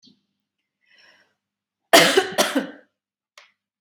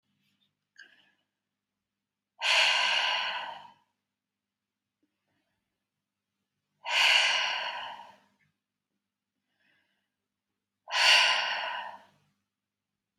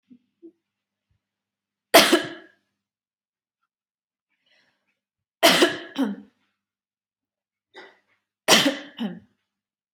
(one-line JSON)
{"cough_length": "3.8 s", "cough_amplitude": 32768, "cough_signal_mean_std_ratio": 0.28, "exhalation_length": "13.2 s", "exhalation_amplitude": 13976, "exhalation_signal_mean_std_ratio": 0.37, "three_cough_length": "9.9 s", "three_cough_amplitude": 32768, "three_cough_signal_mean_std_ratio": 0.25, "survey_phase": "beta (2021-08-13 to 2022-03-07)", "age": "18-44", "gender": "Female", "wearing_mask": "No", "symptom_none": true, "smoker_status": "Never smoked", "respiratory_condition_asthma": false, "respiratory_condition_other": false, "recruitment_source": "REACT", "submission_delay": "2 days", "covid_test_result": "Negative", "covid_test_method": "RT-qPCR", "influenza_a_test_result": "Negative", "influenza_b_test_result": "Negative"}